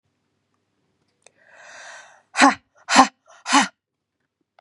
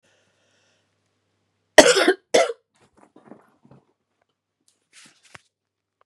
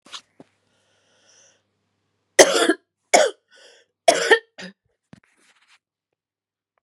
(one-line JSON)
{"exhalation_length": "4.6 s", "exhalation_amplitude": 32768, "exhalation_signal_mean_std_ratio": 0.26, "cough_length": "6.1 s", "cough_amplitude": 32768, "cough_signal_mean_std_ratio": 0.2, "three_cough_length": "6.8 s", "three_cough_amplitude": 32768, "three_cough_signal_mean_std_ratio": 0.24, "survey_phase": "beta (2021-08-13 to 2022-03-07)", "age": "45-64", "gender": "Female", "wearing_mask": "No", "symptom_cough_any": true, "symptom_runny_or_blocked_nose": true, "symptom_sore_throat": true, "symptom_onset": "3 days", "smoker_status": "Never smoked", "respiratory_condition_asthma": false, "respiratory_condition_other": true, "recruitment_source": "Test and Trace", "submission_delay": "1 day", "covid_test_result": "Negative", "covid_test_method": "ePCR"}